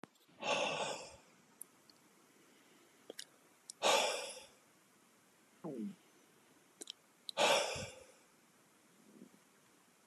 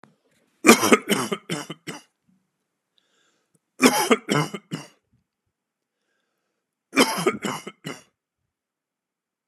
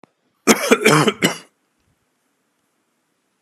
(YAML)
exhalation_length: 10.1 s
exhalation_amplitude: 4047
exhalation_signal_mean_std_ratio: 0.36
three_cough_length: 9.5 s
three_cough_amplitude: 32768
three_cough_signal_mean_std_ratio: 0.29
cough_length: 3.4 s
cough_amplitude: 32768
cough_signal_mean_std_ratio: 0.33
survey_phase: beta (2021-08-13 to 2022-03-07)
age: 45-64
gender: Male
wearing_mask: 'No'
symptom_fatigue: true
symptom_headache: true
symptom_other: true
smoker_status: Ex-smoker
respiratory_condition_asthma: false
respiratory_condition_other: false
recruitment_source: REACT
submission_delay: 1 day
covid_test_result: Negative
covid_test_method: RT-qPCR
influenza_a_test_result: Unknown/Void
influenza_b_test_result: Unknown/Void